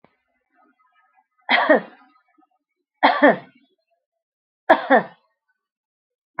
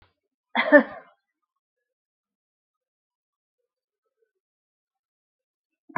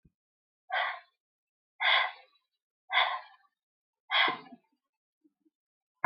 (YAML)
three_cough_length: 6.4 s
three_cough_amplitude: 28403
three_cough_signal_mean_std_ratio: 0.28
cough_length: 6.0 s
cough_amplitude: 26272
cough_signal_mean_std_ratio: 0.15
exhalation_length: 6.1 s
exhalation_amplitude: 8075
exhalation_signal_mean_std_ratio: 0.33
survey_phase: alpha (2021-03-01 to 2021-08-12)
age: 65+
gender: Female
wearing_mask: 'No'
symptom_none: true
smoker_status: Never smoked
respiratory_condition_asthma: false
respiratory_condition_other: false
recruitment_source: REACT
submission_delay: 2 days
covid_test_result: Negative
covid_test_method: RT-qPCR